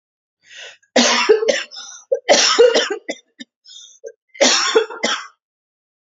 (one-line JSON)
{"cough_length": "6.1 s", "cough_amplitude": 31136, "cough_signal_mean_std_ratio": 0.48, "survey_phase": "alpha (2021-03-01 to 2021-08-12)", "age": "18-44", "gender": "Female", "wearing_mask": "No", "symptom_none": true, "smoker_status": "Never smoked", "respiratory_condition_asthma": false, "respiratory_condition_other": false, "recruitment_source": "REACT", "submission_delay": "1 day", "covid_test_result": "Negative", "covid_test_method": "RT-qPCR"}